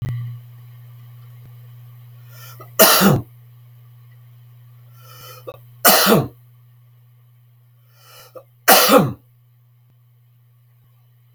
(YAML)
three_cough_length: 11.3 s
three_cough_amplitude: 32768
three_cough_signal_mean_std_ratio: 0.33
survey_phase: beta (2021-08-13 to 2022-03-07)
age: 65+
gender: Male
wearing_mask: 'No'
symptom_none: true
symptom_onset: 8 days
smoker_status: Never smoked
respiratory_condition_asthma: false
respiratory_condition_other: false
recruitment_source: REACT
submission_delay: 2 days
covid_test_result: Negative
covid_test_method: RT-qPCR
influenza_a_test_result: Negative
influenza_b_test_result: Negative